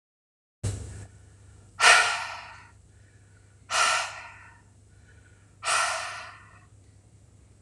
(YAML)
exhalation_length: 7.6 s
exhalation_amplitude: 20179
exhalation_signal_mean_std_ratio: 0.37
survey_phase: alpha (2021-03-01 to 2021-08-12)
age: 45-64
gender: Female
wearing_mask: 'No'
symptom_none: true
smoker_status: Never smoked
respiratory_condition_asthma: false
respiratory_condition_other: false
recruitment_source: REACT
submission_delay: 1 day
covid_test_result: Negative
covid_test_method: RT-qPCR